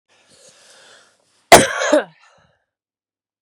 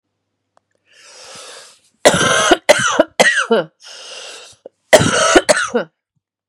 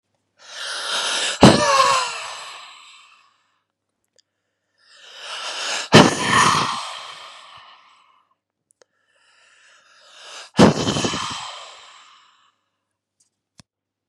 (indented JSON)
{
  "cough_length": "3.4 s",
  "cough_amplitude": 32768,
  "cough_signal_mean_std_ratio": 0.24,
  "three_cough_length": "6.5 s",
  "three_cough_amplitude": 32768,
  "three_cough_signal_mean_std_ratio": 0.45,
  "exhalation_length": "14.1 s",
  "exhalation_amplitude": 32768,
  "exhalation_signal_mean_std_ratio": 0.35,
  "survey_phase": "beta (2021-08-13 to 2022-03-07)",
  "age": "45-64",
  "gender": "Female",
  "wearing_mask": "No",
  "symptom_cough_any": true,
  "symptom_runny_or_blocked_nose": true,
  "symptom_sore_throat": true,
  "symptom_onset": "7 days",
  "smoker_status": "Ex-smoker",
  "respiratory_condition_asthma": true,
  "respiratory_condition_other": false,
  "recruitment_source": "REACT",
  "submission_delay": "1 day",
  "covid_test_result": "Negative",
  "covid_test_method": "RT-qPCR",
  "influenza_a_test_result": "Negative",
  "influenza_b_test_result": "Negative"
}